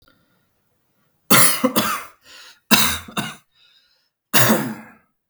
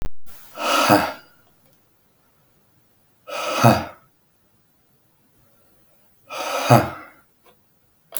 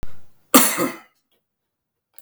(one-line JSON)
{"three_cough_length": "5.3 s", "three_cough_amplitude": 32768, "three_cough_signal_mean_std_ratio": 0.39, "exhalation_length": "8.2 s", "exhalation_amplitude": 32726, "exhalation_signal_mean_std_ratio": 0.36, "cough_length": "2.2 s", "cough_amplitude": 32768, "cough_signal_mean_std_ratio": 0.37, "survey_phase": "beta (2021-08-13 to 2022-03-07)", "age": "18-44", "gender": "Male", "wearing_mask": "No", "symptom_none": true, "smoker_status": "Never smoked", "respiratory_condition_asthma": false, "respiratory_condition_other": false, "recruitment_source": "REACT", "submission_delay": "1 day", "covid_test_result": "Negative", "covid_test_method": "RT-qPCR"}